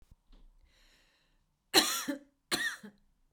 {"three_cough_length": "3.3 s", "three_cough_amplitude": 11279, "three_cough_signal_mean_std_ratio": 0.31, "survey_phase": "beta (2021-08-13 to 2022-03-07)", "age": "45-64", "gender": "Female", "wearing_mask": "No", "symptom_cough_any": true, "symptom_shortness_of_breath": true, "symptom_onset": "11 days", "smoker_status": "Ex-smoker", "respiratory_condition_asthma": false, "respiratory_condition_other": false, "recruitment_source": "REACT", "submission_delay": "0 days", "covid_test_result": "Negative", "covid_test_method": "RT-qPCR"}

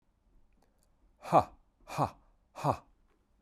{"exhalation_length": "3.4 s", "exhalation_amplitude": 9275, "exhalation_signal_mean_std_ratio": 0.26, "survey_phase": "beta (2021-08-13 to 2022-03-07)", "age": "18-44", "gender": "Male", "wearing_mask": "No", "symptom_none": true, "smoker_status": "Never smoked", "respiratory_condition_asthma": false, "respiratory_condition_other": false, "recruitment_source": "REACT", "submission_delay": "10 days", "covid_test_result": "Negative", "covid_test_method": "RT-qPCR", "covid_ct_value": 46.0, "covid_ct_gene": "N gene"}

